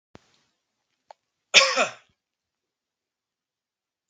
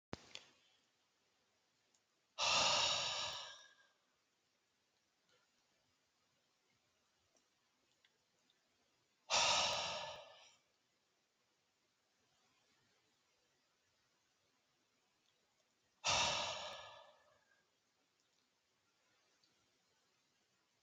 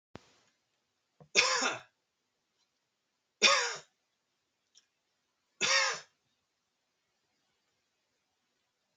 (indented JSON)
{
  "cough_length": "4.1 s",
  "cough_amplitude": 32766,
  "cough_signal_mean_std_ratio": 0.2,
  "exhalation_length": "20.8 s",
  "exhalation_amplitude": 2615,
  "exhalation_signal_mean_std_ratio": 0.29,
  "three_cough_length": "9.0 s",
  "three_cough_amplitude": 11523,
  "three_cough_signal_mean_std_ratio": 0.26,
  "survey_phase": "beta (2021-08-13 to 2022-03-07)",
  "age": "65+",
  "gender": "Male",
  "wearing_mask": "No",
  "symptom_none": true,
  "smoker_status": "Never smoked",
  "respiratory_condition_asthma": false,
  "respiratory_condition_other": false,
  "recruitment_source": "REACT",
  "submission_delay": "4 days",
  "covid_test_result": "Negative",
  "covid_test_method": "RT-qPCR"
}